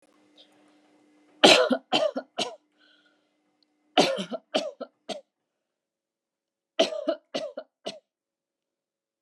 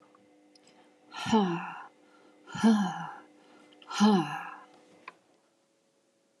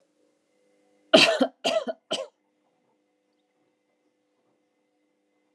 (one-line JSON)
{"three_cough_length": "9.2 s", "three_cough_amplitude": 28932, "three_cough_signal_mean_std_ratio": 0.29, "exhalation_length": "6.4 s", "exhalation_amplitude": 8480, "exhalation_signal_mean_std_ratio": 0.38, "cough_length": "5.5 s", "cough_amplitude": 29938, "cough_signal_mean_std_ratio": 0.24, "survey_phase": "alpha (2021-03-01 to 2021-08-12)", "age": "18-44", "gender": "Female", "wearing_mask": "No", "symptom_none": true, "smoker_status": "Never smoked", "respiratory_condition_asthma": false, "respiratory_condition_other": false, "recruitment_source": "REACT", "submission_delay": "1 day", "covid_test_result": "Negative", "covid_test_method": "RT-qPCR"}